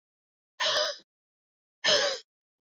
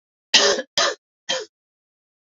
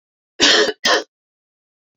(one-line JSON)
{"exhalation_length": "2.7 s", "exhalation_amplitude": 9337, "exhalation_signal_mean_std_ratio": 0.4, "three_cough_length": "2.3 s", "three_cough_amplitude": 29106, "three_cough_signal_mean_std_ratio": 0.37, "cough_length": "2.0 s", "cough_amplitude": 30776, "cough_signal_mean_std_ratio": 0.41, "survey_phase": "beta (2021-08-13 to 2022-03-07)", "age": "45-64", "gender": "Female", "wearing_mask": "No", "symptom_cough_any": true, "symptom_runny_or_blocked_nose": true, "symptom_fatigue": true, "symptom_fever_high_temperature": true, "symptom_change_to_sense_of_smell_or_taste": true, "symptom_onset": "4 days", "smoker_status": "Never smoked", "respiratory_condition_asthma": true, "respiratory_condition_other": false, "recruitment_source": "Test and Trace", "submission_delay": "2 days", "covid_test_result": "Positive", "covid_test_method": "RT-qPCR", "covid_ct_value": 14.7, "covid_ct_gene": "ORF1ab gene", "covid_ct_mean": 15.1, "covid_viral_load": "12000000 copies/ml", "covid_viral_load_category": "High viral load (>1M copies/ml)"}